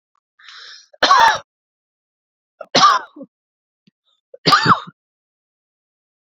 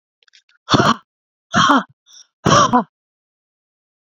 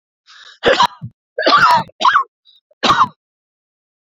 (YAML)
three_cough_length: 6.4 s
three_cough_amplitude: 32607
three_cough_signal_mean_std_ratio: 0.31
exhalation_length: 4.0 s
exhalation_amplitude: 32765
exhalation_signal_mean_std_ratio: 0.38
cough_length: 4.1 s
cough_amplitude: 29907
cough_signal_mean_std_ratio: 0.45
survey_phase: beta (2021-08-13 to 2022-03-07)
age: 45-64
gender: Female
wearing_mask: 'No'
symptom_none: true
smoker_status: Never smoked
respiratory_condition_asthma: true
respiratory_condition_other: false
recruitment_source: REACT
submission_delay: 1 day
covid_test_result: Negative
covid_test_method: RT-qPCR